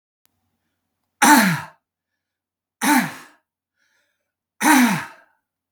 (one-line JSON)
{"three_cough_length": "5.7 s", "three_cough_amplitude": 30838, "three_cough_signal_mean_std_ratio": 0.34, "survey_phase": "beta (2021-08-13 to 2022-03-07)", "age": "65+", "gender": "Male", "wearing_mask": "No", "symptom_none": true, "smoker_status": "Never smoked", "respiratory_condition_asthma": false, "respiratory_condition_other": false, "recruitment_source": "REACT", "submission_delay": "5 days", "covid_test_result": "Negative", "covid_test_method": "RT-qPCR", "influenza_a_test_result": "Negative", "influenza_b_test_result": "Negative"}